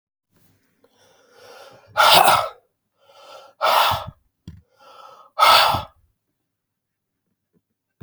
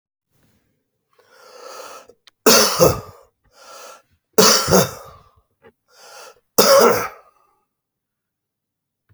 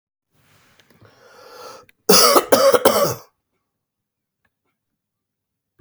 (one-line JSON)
{"exhalation_length": "8.0 s", "exhalation_amplitude": 32768, "exhalation_signal_mean_std_ratio": 0.33, "three_cough_length": "9.1 s", "three_cough_amplitude": 32768, "three_cough_signal_mean_std_ratio": 0.33, "cough_length": "5.8 s", "cough_amplitude": 32768, "cough_signal_mean_std_ratio": 0.32, "survey_phase": "beta (2021-08-13 to 2022-03-07)", "age": "45-64", "gender": "Male", "wearing_mask": "No", "symptom_cough_any": true, "symptom_runny_or_blocked_nose": true, "symptom_sore_throat": true, "symptom_fatigue": true, "symptom_change_to_sense_of_smell_or_taste": true, "symptom_loss_of_taste": true, "symptom_onset": "7 days", "smoker_status": "Ex-smoker", "respiratory_condition_asthma": false, "respiratory_condition_other": false, "recruitment_source": "REACT", "submission_delay": "1 day", "covid_test_result": "Negative", "covid_test_method": "RT-qPCR", "influenza_a_test_result": "Negative", "influenza_b_test_result": "Negative"}